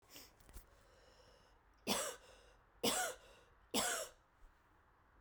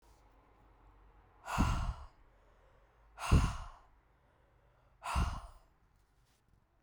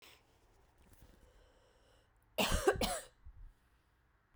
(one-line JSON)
{"three_cough_length": "5.2 s", "three_cough_amplitude": 2717, "three_cough_signal_mean_std_ratio": 0.4, "exhalation_length": "6.8 s", "exhalation_amplitude": 7011, "exhalation_signal_mean_std_ratio": 0.34, "cough_length": "4.4 s", "cough_amplitude": 4220, "cough_signal_mean_std_ratio": 0.32, "survey_phase": "beta (2021-08-13 to 2022-03-07)", "age": "18-44", "gender": "Female", "wearing_mask": "No", "symptom_cough_any": true, "symptom_runny_or_blocked_nose": true, "symptom_fever_high_temperature": true, "symptom_headache": true, "symptom_change_to_sense_of_smell_or_taste": true, "symptom_onset": "2 days", "smoker_status": "Never smoked", "respiratory_condition_asthma": false, "respiratory_condition_other": false, "recruitment_source": "Test and Trace", "submission_delay": "2 days", "covid_test_result": "Positive", "covid_test_method": "RT-qPCR", "covid_ct_value": 24.3, "covid_ct_gene": "ORF1ab gene", "covid_ct_mean": 24.7, "covid_viral_load": "7700 copies/ml", "covid_viral_load_category": "Minimal viral load (< 10K copies/ml)"}